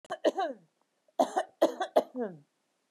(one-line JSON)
{"cough_length": "2.9 s", "cough_amplitude": 9739, "cough_signal_mean_std_ratio": 0.39, "survey_phase": "beta (2021-08-13 to 2022-03-07)", "age": "45-64", "gender": "Female", "wearing_mask": "No", "symptom_none": true, "smoker_status": "Never smoked", "respiratory_condition_asthma": true, "respiratory_condition_other": false, "recruitment_source": "REACT", "submission_delay": "3 days", "covid_test_result": "Negative", "covid_test_method": "RT-qPCR", "influenza_a_test_result": "Negative", "influenza_b_test_result": "Negative"}